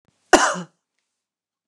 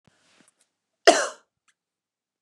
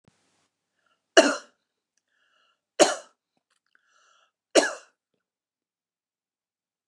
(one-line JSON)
{"exhalation_length": "1.7 s", "exhalation_amplitude": 29204, "exhalation_signal_mean_std_ratio": 0.26, "cough_length": "2.4 s", "cough_amplitude": 29187, "cough_signal_mean_std_ratio": 0.19, "three_cough_length": "6.9 s", "three_cough_amplitude": 28714, "three_cough_signal_mean_std_ratio": 0.18, "survey_phase": "beta (2021-08-13 to 2022-03-07)", "age": "45-64", "gender": "Female", "wearing_mask": "No", "symptom_none": true, "smoker_status": "Never smoked", "respiratory_condition_asthma": false, "respiratory_condition_other": false, "recruitment_source": "REACT", "submission_delay": "3 days", "covid_test_result": "Negative", "covid_test_method": "RT-qPCR", "influenza_a_test_result": "Negative", "influenza_b_test_result": "Negative"}